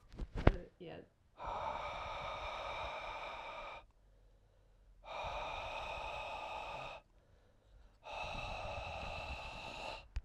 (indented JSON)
{
  "exhalation_length": "10.2 s",
  "exhalation_amplitude": 10706,
  "exhalation_signal_mean_std_ratio": 0.63,
  "survey_phase": "alpha (2021-03-01 to 2021-08-12)",
  "age": "18-44",
  "gender": "Male",
  "wearing_mask": "No",
  "symptom_cough_any": true,
  "symptom_fatigue": true,
  "symptom_headache": true,
  "smoker_status": "Ex-smoker",
  "respiratory_condition_asthma": false,
  "respiratory_condition_other": false,
  "recruitment_source": "Test and Trace",
  "submission_delay": "3 days",
  "covid_test_result": "Positive",
  "covid_test_method": "LFT"
}